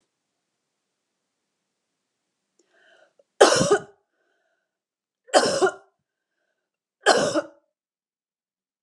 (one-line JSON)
{"three_cough_length": "8.8 s", "three_cough_amplitude": 32177, "three_cough_signal_mean_std_ratio": 0.26, "survey_phase": "beta (2021-08-13 to 2022-03-07)", "age": "45-64", "gender": "Female", "wearing_mask": "No", "symptom_none": true, "smoker_status": "Never smoked", "respiratory_condition_asthma": false, "respiratory_condition_other": false, "recruitment_source": "REACT", "submission_delay": "2 days", "covid_test_result": "Negative", "covid_test_method": "RT-qPCR", "influenza_a_test_result": "Negative", "influenza_b_test_result": "Negative"}